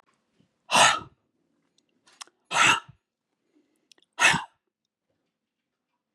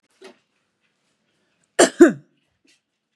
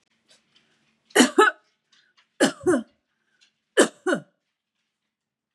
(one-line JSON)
{"exhalation_length": "6.1 s", "exhalation_amplitude": 21145, "exhalation_signal_mean_std_ratio": 0.27, "cough_length": "3.2 s", "cough_amplitude": 32728, "cough_signal_mean_std_ratio": 0.2, "three_cough_length": "5.5 s", "three_cough_amplitude": 26194, "three_cough_signal_mean_std_ratio": 0.29, "survey_phase": "beta (2021-08-13 to 2022-03-07)", "age": "45-64", "gender": "Female", "wearing_mask": "No", "symptom_none": true, "smoker_status": "Ex-smoker", "respiratory_condition_asthma": false, "respiratory_condition_other": false, "recruitment_source": "REACT", "submission_delay": "1 day", "covid_test_result": "Negative", "covid_test_method": "RT-qPCR", "influenza_a_test_result": "Negative", "influenza_b_test_result": "Negative"}